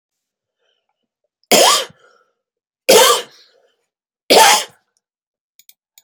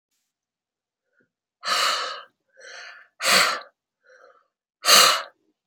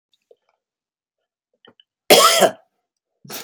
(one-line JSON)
{"three_cough_length": "6.0 s", "three_cough_amplitude": 32768, "three_cough_signal_mean_std_ratio": 0.33, "exhalation_length": "5.7 s", "exhalation_amplitude": 28764, "exhalation_signal_mean_std_ratio": 0.35, "cough_length": "3.4 s", "cough_amplitude": 32768, "cough_signal_mean_std_ratio": 0.28, "survey_phase": "beta (2021-08-13 to 2022-03-07)", "age": "65+", "gender": "Female", "wearing_mask": "No", "symptom_none": true, "smoker_status": "Never smoked", "respiratory_condition_asthma": false, "respiratory_condition_other": false, "recruitment_source": "REACT", "submission_delay": "4 days", "covid_test_result": "Negative", "covid_test_method": "RT-qPCR"}